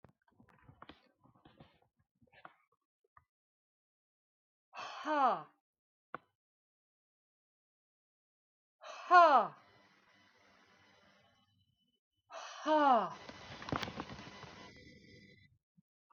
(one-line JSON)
{"exhalation_length": "16.1 s", "exhalation_amplitude": 7913, "exhalation_signal_mean_std_ratio": 0.25, "survey_phase": "beta (2021-08-13 to 2022-03-07)", "age": "45-64", "gender": "Female", "wearing_mask": "No", "symptom_none": true, "smoker_status": "Ex-smoker", "respiratory_condition_asthma": false, "respiratory_condition_other": false, "recruitment_source": "REACT", "submission_delay": "1 day", "covid_test_result": "Negative", "covid_test_method": "RT-qPCR", "influenza_a_test_result": "Unknown/Void", "influenza_b_test_result": "Unknown/Void"}